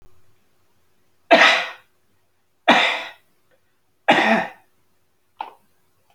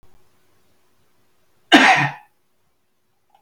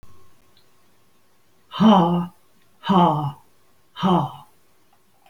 {"three_cough_length": "6.1 s", "three_cough_amplitude": 28651, "three_cough_signal_mean_std_ratio": 0.33, "cough_length": "3.4 s", "cough_amplitude": 30480, "cough_signal_mean_std_ratio": 0.27, "exhalation_length": "5.3 s", "exhalation_amplitude": 22145, "exhalation_signal_mean_std_ratio": 0.4, "survey_phase": "alpha (2021-03-01 to 2021-08-12)", "age": "45-64", "gender": "Male", "wearing_mask": "No", "symptom_none": true, "smoker_status": "Ex-smoker", "respiratory_condition_asthma": false, "respiratory_condition_other": false, "recruitment_source": "REACT", "submission_delay": "1 day", "covid_test_result": "Negative", "covid_test_method": "RT-qPCR"}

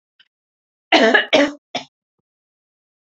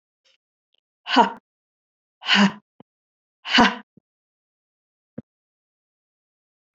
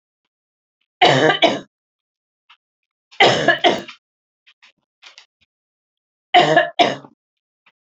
{"cough_length": "3.1 s", "cough_amplitude": 31218, "cough_signal_mean_std_ratio": 0.33, "exhalation_length": "6.7 s", "exhalation_amplitude": 27412, "exhalation_signal_mean_std_ratio": 0.24, "three_cough_length": "7.9 s", "three_cough_amplitude": 29552, "three_cough_signal_mean_std_ratio": 0.34, "survey_phase": "beta (2021-08-13 to 2022-03-07)", "age": "45-64", "gender": "Female", "wearing_mask": "No", "symptom_cough_any": true, "symptom_runny_or_blocked_nose": true, "symptom_sore_throat": true, "symptom_fatigue": true, "symptom_headache": true, "symptom_onset": "3 days", "smoker_status": "Never smoked", "respiratory_condition_asthma": false, "respiratory_condition_other": false, "recruitment_source": "Test and Trace", "submission_delay": "2 days", "covid_test_result": "Positive", "covid_test_method": "RT-qPCR", "covid_ct_value": 16.8, "covid_ct_gene": "ORF1ab gene", "covid_ct_mean": 17.9, "covid_viral_load": "1400000 copies/ml", "covid_viral_load_category": "High viral load (>1M copies/ml)"}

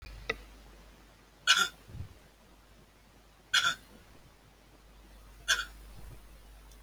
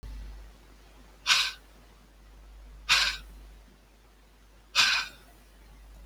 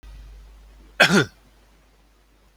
{"three_cough_length": "6.8 s", "three_cough_amplitude": 11598, "three_cough_signal_mean_std_ratio": 0.33, "exhalation_length": "6.1 s", "exhalation_amplitude": 12828, "exhalation_signal_mean_std_ratio": 0.38, "cough_length": "2.6 s", "cough_amplitude": 31037, "cough_signal_mean_std_ratio": 0.29, "survey_phase": "beta (2021-08-13 to 2022-03-07)", "age": "65+", "gender": "Male", "wearing_mask": "No", "symptom_cough_any": true, "symptom_runny_or_blocked_nose": true, "smoker_status": "Ex-smoker", "respiratory_condition_asthma": false, "respiratory_condition_other": false, "recruitment_source": "REACT", "submission_delay": "4 days", "covid_test_result": "Negative", "covid_test_method": "RT-qPCR"}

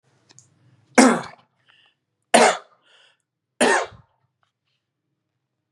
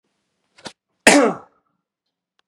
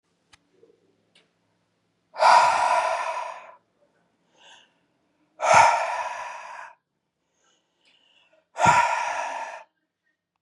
{"three_cough_length": "5.7 s", "three_cough_amplitude": 32767, "three_cough_signal_mean_std_ratio": 0.27, "cough_length": "2.5 s", "cough_amplitude": 32768, "cough_signal_mean_std_ratio": 0.26, "exhalation_length": "10.4 s", "exhalation_amplitude": 25480, "exhalation_signal_mean_std_ratio": 0.38, "survey_phase": "beta (2021-08-13 to 2022-03-07)", "age": "18-44", "gender": "Male", "wearing_mask": "No", "symptom_cough_any": true, "symptom_runny_or_blocked_nose": true, "symptom_shortness_of_breath": true, "symptom_fatigue": true, "symptom_headache": true, "symptom_onset": "3 days", "smoker_status": "Never smoked", "respiratory_condition_asthma": false, "respiratory_condition_other": false, "recruitment_source": "Test and Trace", "submission_delay": "2 days", "covid_test_result": "Positive", "covid_test_method": "RT-qPCR", "covid_ct_value": 22.3, "covid_ct_gene": "ORF1ab gene", "covid_ct_mean": 22.8, "covid_viral_load": "33000 copies/ml", "covid_viral_load_category": "Low viral load (10K-1M copies/ml)"}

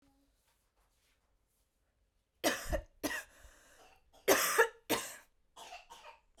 {"cough_length": "6.4 s", "cough_amplitude": 7426, "cough_signal_mean_std_ratio": 0.32, "survey_phase": "beta (2021-08-13 to 2022-03-07)", "age": "18-44", "gender": "Female", "wearing_mask": "No", "symptom_none": true, "smoker_status": "Ex-smoker", "respiratory_condition_asthma": false, "respiratory_condition_other": false, "recruitment_source": "REACT", "submission_delay": "1 day", "covid_test_result": "Negative", "covid_test_method": "RT-qPCR", "influenza_a_test_result": "Negative", "influenza_b_test_result": "Negative"}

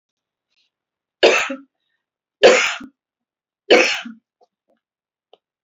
{"three_cough_length": "5.6 s", "three_cough_amplitude": 32768, "three_cough_signal_mean_std_ratio": 0.3, "survey_phase": "beta (2021-08-13 to 2022-03-07)", "age": "45-64", "gender": "Female", "wearing_mask": "No", "symptom_none": true, "smoker_status": "Never smoked", "respiratory_condition_asthma": true, "respiratory_condition_other": false, "recruitment_source": "REACT", "submission_delay": "1 day", "covid_test_result": "Negative", "covid_test_method": "RT-qPCR", "influenza_a_test_result": "Unknown/Void", "influenza_b_test_result": "Unknown/Void"}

